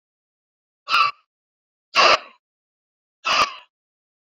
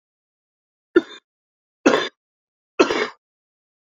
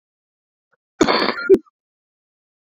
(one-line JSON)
{"exhalation_length": "4.4 s", "exhalation_amplitude": 26852, "exhalation_signal_mean_std_ratio": 0.31, "three_cough_length": "3.9 s", "three_cough_amplitude": 28052, "three_cough_signal_mean_std_ratio": 0.25, "cough_length": "2.7 s", "cough_amplitude": 27653, "cough_signal_mean_std_ratio": 0.29, "survey_phase": "beta (2021-08-13 to 2022-03-07)", "age": "45-64", "gender": "Male", "wearing_mask": "No", "symptom_cough_any": true, "symptom_runny_or_blocked_nose": true, "symptom_abdominal_pain": true, "symptom_change_to_sense_of_smell_or_taste": true, "symptom_loss_of_taste": true, "symptom_other": true, "symptom_onset": "3 days", "smoker_status": "Ex-smoker", "respiratory_condition_asthma": true, "respiratory_condition_other": false, "recruitment_source": "Test and Trace", "submission_delay": "1 day", "covid_test_result": "Positive", "covid_test_method": "RT-qPCR", "covid_ct_value": 14.9, "covid_ct_gene": "ORF1ab gene", "covid_ct_mean": 15.9, "covid_viral_load": "6000000 copies/ml", "covid_viral_load_category": "High viral load (>1M copies/ml)"}